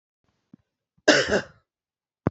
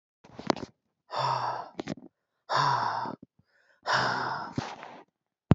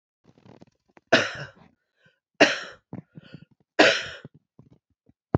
{
  "cough_length": "2.3 s",
  "cough_amplitude": 27753,
  "cough_signal_mean_std_ratio": 0.28,
  "exhalation_length": "5.5 s",
  "exhalation_amplitude": 17787,
  "exhalation_signal_mean_std_ratio": 0.47,
  "three_cough_length": "5.4 s",
  "three_cough_amplitude": 27026,
  "three_cough_signal_mean_std_ratio": 0.26,
  "survey_phase": "beta (2021-08-13 to 2022-03-07)",
  "age": "18-44",
  "gender": "Male",
  "wearing_mask": "No",
  "symptom_runny_or_blocked_nose": true,
  "smoker_status": "Never smoked",
  "respiratory_condition_asthma": true,
  "respiratory_condition_other": false,
  "recruitment_source": "REACT",
  "submission_delay": "2 days",
  "covid_test_result": "Negative",
  "covid_test_method": "RT-qPCR",
  "influenza_a_test_result": "Negative",
  "influenza_b_test_result": "Negative"
}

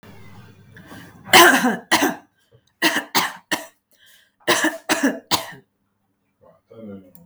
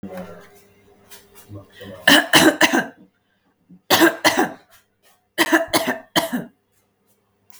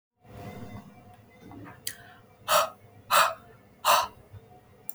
{
  "cough_length": "7.3 s",
  "cough_amplitude": 32768,
  "cough_signal_mean_std_ratio": 0.38,
  "three_cough_length": "7.6 s",
  "three_cough_amplitude": 32768,
  "three_cough_signal_mean_std_ratio": 0.39,
  "exhalation_length": "4.9 s",
  "exhalation_amplitude": 15304,
  "exhalation_signal_mean_std_ratio": 0.36,
  "survey_phase": "beta (2021-08-13 to 2022-03-07)",
  "age": "45-64",
  "gender": "Female",
  "wearing_mask": "No",
  "symptom_none": true,
  "smoker_status": "Ex-smoker",
  "respiratory_condition_asthma": false,
  "respiratory_condition_other": false,
  "recruitment_source": "REACT",
  "submission_delay": "2 days",
  "covid_test_result": "Negative",
  "covid_test_method": "RT-qPCR",
  "influenza_a_test_result": "Unknown/Void",
  "influenza_b_test_result": "Unknown/Void"
}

